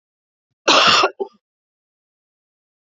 {"cough_length": "3.0 s", "cough_amplitude": 28626, "cough_signal_mean_std_ratio": 0.32, "survey_phase": "beta (2021-08-13 to 2022-03-07)", "age": "45-64", "gender": "Female", "wearing_mask": "No", "symptom_cough_any": true, "symptom_new_continuous_cough": true, "symptom_runny_or_blocked_nose": true, "symptom_shortness_of_breath": true, "symptom_sore_throat": true, "symptom_fatigue": true, "symptom_onset": "4 days", "smoker_status": "Never smoked", "respiratory_condition_asthma": false, "respiratory_condition_other": false, "recruitment_source": "Test and Trace", "submission_delay": "1 day", "covid_test_result": "Negative", "covid_test_method": "RT-qPCR"}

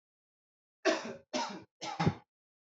{"three_cough_length": "2.7 s", "three_cough_amplitude": 6154, "three_cough_signal_mean_std_ratio": 0.38, "survey_phase": "alpha (2021-03-01 to 2021-08-12)", "age": "18-44", "gender": "Male", "wearing_mask": "No", "symptom_none": true, "smoker_status": "Never smoked", "respiratory_condition_asthma": false, "respiratory_condition_other": false, "recruitment_source": "REACT", "submission_delay": "1 day", "covid_test_result": "Negative", "covid_test_method": "RT-qPCR"}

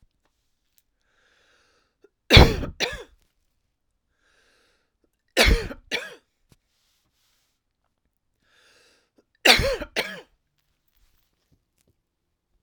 {"three_cough_length": "12.6 s", "three_cough_amplitude": 32768, "three_cough_signal_mean_std_ratio": 0.21, "survey_phase": "alpha (2021-03-01 to 2021-08-12)", "age": "45-64", "gender": "Female", "wearing_mask": "No", "symptom_shortness_of_breath": true, "symptom_fatigue": true, "symptom_headache": true, "smoker_status": "Ex-smoker", "respiratory_condition_asthma": true, "respiratory_condition_other": false, "recruitment_source": "Test and Trace", "submission_delay": "2 days", "covid_test_result": "Positive", "covid_test_method": "RT-qPCR", "covid_ct_value": 37.4, "covid_ct_gene": "ORF1ab gene"}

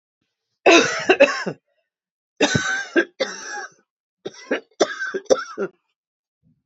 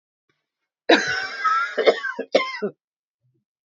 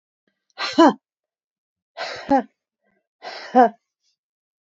{"three_cough_length": "6.7 s", "three_cough_amplitude": 28820, "three_cough_signal_mean_std_ratio": 0.39, "cough_length": "3.7 s", "cough_amplitude": 27379, "cough_signal_mean_std_ratio": 0.44, "exhalation_length": "4.6 s", "exhalation_amplitude": 26502, "exhalation_signal_mean_std_ratio": 0.27, "survey_phase": "beta (2021-08-13 to 2022-03-07)", "age": "45-64", "gender": "Female", "wearing_mask": "No", "symptom_cough_any": true, "symptom_runny_or_blocked_nose": true, "symptom_abdominal_pain": true, "symptom_fatigue": true, "symptom_headache": true, "symptom_change_to_sense_of_smell_or_taste": true, "symptom_onset": "12 days", "smoker_status": "Ex-smoker", "respiratory_condition_asthma": false, "respiratory_condition_other": false, "recruitment_source": "REACT", "submission_delay": "1 day", "covid_test_result": "Negative", "covid_test_method": "RT-qPCR", "influenza_a_test_result": "Negative", "influenza_b_test_result": "Negative"}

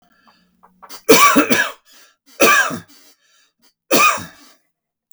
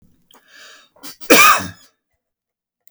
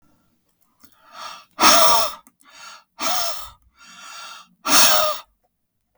{"three_cough_length": "5.1 s", "three_cough_amplitude": 32768, "three_cough_signal_mean_std_ratio": 0.41, "cough_length": "2.9 s", "cough_amplitude": 32768, "cough_signal_mean_std_ratio": 0.3, "exhalation_length": "6.0 s", "exhalation_amplitude": 32768, "exhalation_signal_mean_std_ratio": 0.4, "survey_phase": "beta (2021-08-13 to 2022-03-07)", "age": "45-64", "gender": "Male", "wearing_mask": "No", "symptom_cough_any": true, "symptom_onset": "4 days", "smoker_status": "Ex-smoker", "respiratory_condition_asthma": false, "respiratory_condition_other": false, "recruitment_source": "REACT", "submission_delay": "3 days", "covid_test_result": "Negative", "covid_test_method": "RT-qPCR", "influenza_a_test_result": "Negative", "influenza_b_test_result": "Negative"}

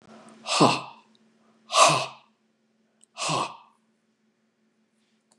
{"exhalation_length": "5.4 s", "exhalation_amplitude": 23907, "exhalation_signal_mean_std_ratio": 0.31, "survey_phase": "beta (2021-08-13 to 2022-03-07)", "age": "65+", "gender": "Male", "wearing_mask": "No", "symptom_none": true, "smoker_status": "Ex-smoker", "respiratory_condition_asthma": false, "respiratory_condition_other": false, "recruitment_source": "REACT", "submission_delay": "0 days", "covid_test_result": "Negative", "covid_test_method": "RT-qPCR", "influenza_a_test_result": "Negative", "influenza_b_test_result": "Negative"}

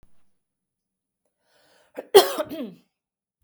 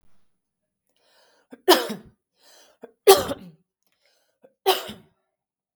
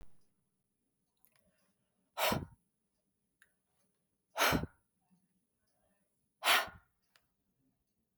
{"cough_length": "3.4 s", "cough_amplitude": 32127, "cough_signal_mean_std_ratio": 0.19, "three_cough_length": "5.8 s", "three_cough_amplitude": 32768, "three_cough_signal_mean_std_ratio": 0.22, "exhalation_length": "8.2 s", "exhalation_amplitude": 5892, "exhalation_signal_mean_std_ratio": 0.24, "survey_phase": "beta (2021-08-13 to 2022-03-07)", "age": "45-64", "gender": "Female", "wearing_mask": "No", "symptom_none": true, "smoker_status": "Never smoked", "respiratory_condition_asthma": false, "respiratory_condition_other": false, "recruitment_source": "REACT", "submission_delay": "0 days", "covid_test_result": "Negative", "covid_test_method": "RT-qPCR", "influenza_a_test_result": "Unknown/Void", "influenza_b_test_result": "Unknown/Void"}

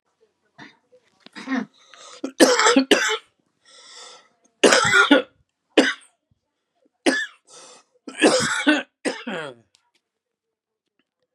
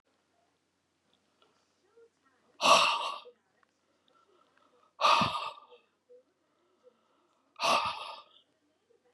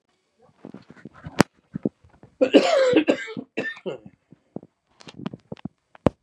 {"three_cough_length": "11.3 s", "three_cough_amplitude": 32768, "three_cough_signal_mean_std_ratio": 0.37, "exhalation_length": "9.1 s", "exhalation_amplitude": 13123, "exhalation_signal_mean_std_ratio": 0.3, "cough_length": "6.2 s", "cough_amplitude": 32768, "cough_signal_mean_std_ratio": 0.32, "survey_phase": "beta (2021-08-13 to 2022-03-07)", "age": "45-64", "gender": "Male", "wearing_mask": "No", "symptom_cough_any": true, "symptom_runny_or_blocked_nose": true, "symptom_shortness_of_breath": true, "symptom_sore_throat": true, "symptom_fatigue": true, "symptom_change_to_sense_of_smell_or_taste": true, "symptom_loss_of_taste": true, "symptom_onset": "4 days", "smoker_status": "Ex-smoker", "respiratory_condition_asthma": false, "respiratory_condition_other": false, "recruitment_source": "Test and Trace", "submission_delay": "2 days", "covid_test_result": "Positive", "covid_test_method": "RT-qPCR", "covid_ct_value": 26.4, "covid_ct_gene": "N gene", "covid_ct_mean": 26.5, "covid_viral_load": "2100 copies/ml", "covid_viral_load_category": "Minimal viral load (< 10K copies/ml)"}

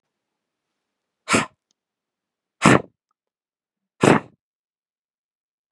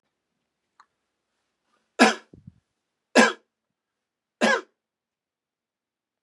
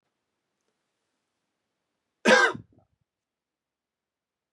{"exhalation_length": "5.7 s", "exhalation_amplitude": 32767, "exhalation_signal_mean_std_ratio": 0.21, "three_cough_length": "6.2 s", "three_cough_amplitude": 25532, "three_cough_signal_mean_std_ratio": 0.21, "cough_length": "4.5 s", "cough_amplitude": 18134, "cough_signal_mean_std_ratio": 0.19, "survey_phase": "beta (2021-08-13 to 2022-03-07)", "age": "45-64", "gender": "Male", "wearing_mask": "No", "symptom_none": true, "smoker_status": "Never smoked", "respiratory_condition_asthma": false, "respiratory_condition_other": false, "recruitment_source": "REACT", "submission_delay": "2 days", "covid_test_result": "Negative", "covid_test_method": "RT-qPCR", "influenza_a_test_result": "Negative", "influenza_b_test_result": "Negative"}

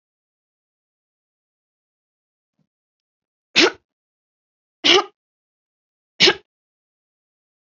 {"three_cough_length": "7.7 s", "three_cough_amplitude": 32767, "three_cough_signal_mean_std_ratio": 0.19, "survey_phase": "beta (2021-08-13 to 2022-03-07)", "age": "65+", "gender": "Female", "wearing_mask": "No", "symptom_none": true, "smoker_status": "Never smoked", "respiratory_condition_asthma": false, "respiratory_condition_other": false, "recruitment_source": "REACT", "submission_delay": "2 days", "covid_test_result": "Negative", "covid_test_method": "RT-qPCR", "influenza_a_test_result": "Negative", "influenza_b_test_result": "Negative"}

